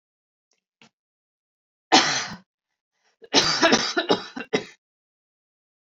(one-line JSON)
{"cough_length": "5.9 s", "cough_amplitude": 26419, "cough_signal_mean_std_ratio": 0.33, "survey_phase": "alpha (2021-03-01 to 2021-08-12)", "age": "45-64", "gender": "Female", "wearing_mask": "No", "symptom_none": true, "smoker_status": "Never smoked", "respiratory_condition_asthma": false, "respiratory_condition_other": false, "recruitment_source": "REACT", "submission_delay": "1 day", "covid_test_result": "Negative", "covid_test_method": "RT-qPCR"}